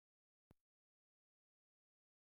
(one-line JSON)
{"cough_length": "2.4 s", "cough_amplitude": 81, "cough_signal_mean_std_ratio": 0.09, "survey_phase": "beta (2021-08-13 to 2022-03-07)", "age": "18-44", "gender": "Male", "wearing_mask": "No", "symptom_none": true, "smoker_status": "Never smoked", "respiratory_condition_asthma": false, "respiratory_condition_other": false, "recruitment_source": "REACT", "submission_delay": "3 days", "covid_test_result": "Negative", "covid_test_method": "RT-qPCR"}